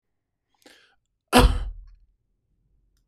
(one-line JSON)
{"cough_length": "3.1 s", "cough_amplitude": 25941, "cough_signal_mean_std_ratio": 0.25, "survey_phase": "beta (2021-08-13 to 2022-03-07)", "age": "45-64", "gender": "Male", "wearing_mask": "No", "symptom_none": true, "smoker_status": "Ex-smoker", "respiratory_condition_asthma": false, "respiratory_condition_other": false, "recruitment_source": "REACT", "submission_delay": "2 days", "covid_test_result": "Negative", "covid_test_method": "RT-qPCR", "influenza_a_test_result": "Negative", "influenza_b_test_result": "Negative"}